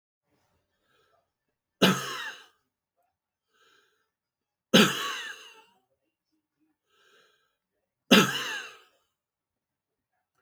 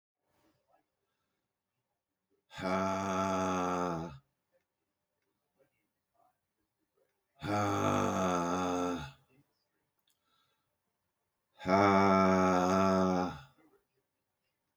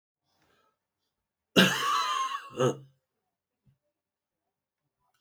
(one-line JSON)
{"three_cough_length": "10.4 s", "three_cough_amplitude": 21862, "three_cough_signal_mean_std_ratio": 0.23, "exhalation_length": "14.8 s", "exhalation_amplitude": 7665, "exhalation_signal_mean_std_ratio": 0.45, "cough_length": "5.2 s", "cough_amplitude": 15867, "cough_signal_mean_std_ratio": 0.32, "survey_phase": "beta (2021-08-13 to 2022-03-07)", "age": "65+", "gender": "Male", "wearing_mask": "No", "symptom_headache": true, "smoker_status": "Never smoked", "respiratory_condition_asthma": false, "respiratory_condition_other": false, "recruitment_source": "REACT", "submission_delay": "2 days", "covid_test_result": "Negative", "covid_test_method": "RT-qPCR"}